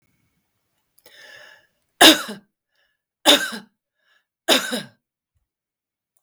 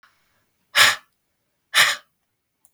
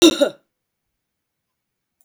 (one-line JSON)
{"three_cough_length": "6.2 s", "three_cough_amplitude": 32768, "three_cough_signal_mean_std_ratio": 0.24, "exhalation_length": "2.7 s", "exhalation_amplitude": 32768, "exhalation_signal_mean_std_ratio": 0.29, "cough_length": "2.0 s", "cough_amplitude": 31979, "cough_signal_mean_std_ratio": 0.25, "survey_phase": "beta (2021-08-13 to 2022-03-07)", "age": "65+", "gender": "Female", "wearing_mask": "No", "symptom_cough_any": true, "symptom_onset": "12 days", "smoker_status": "Never smoked", "respiratory_condition_asthma": false, "respiratory_condition_other": false, "recruitment_source": "REACT", "submission_delay": "1 day", "covid_test_result": "Negative", "covid_test_method": "RT-qPCR"}